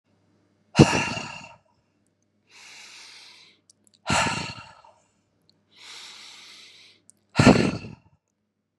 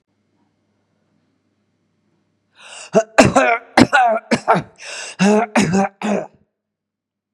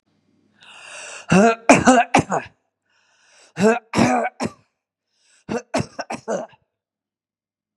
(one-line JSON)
{"exhalation_length": "8.8 s", "exhalation_amplitude": 32768, "exhalation_signal_mean_std_ratio": 0.27, "cough_length": "7.3 s", "cough_amplitude": 32768, "cough_signal_mean_std_ratio": 0.41, "three_cough_length": "7.8 s", "three_cough_amplitude": 32767, "three_cough_signal_mean_std_ratio": 0.37, "survey_phase": "beta (2021-08-13 to 2022-03-07)", "age": "65+", "gender": "Female", "wearing_mask": "No", "symptom_none": true, "smoker_status": "Ex-smoker", "respiratory_condition_asthma": false, "respiratory_condition_other": false, "recruitment_source": "REACT", "submission_delay": "1 day", "covid_test_result": "Negative", "covid_test_method": "RT-qPCR", "influenza_a_test_result": "Negative", "influenza_b_test_result": "Negative"}